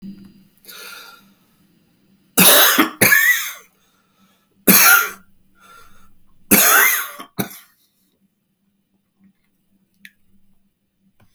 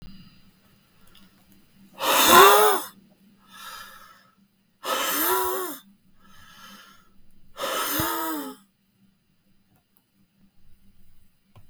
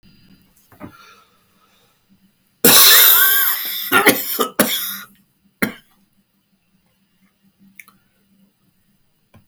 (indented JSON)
{
  "three_cough_length": "11.3 s",
  "three_cough_amplitude": 32768,
  "three_cough_signal_mean_std_ratio": 0.35,
  "exhalation_length": "11.7 s",
  "exhalation_amplitude": 32768,
  "exhalation_signal_mean_std_ratio": 0.34,
  "cough_length": "9.5 s",
  "cough_amplitude": 32768,
  "cough_signal_mean_std_ratio": 0.35,
  "survey_phase": "beta (2021-08-13 to 2022-03-07)",
  "age": "65+",
  "gender": "Male",
  "wearing_mask": "No",
  "symptom_cough_any": true,
  "symptom_runny_or_blocked_nose": true,
  "smoker_status": "Ex-smoker",
  "respiratory_condition_asthma": false,
  "respiratory_condition_other": false,
  "recruitment_source": "REACT",
  "submission_delay": "3 days",
  "covid_test_result": "Negative",
  "covid_test_method": "RT-qPCR",
  "influenza_a_test_result": "Negative",
  "influenza_b_test_result": "Negative"
}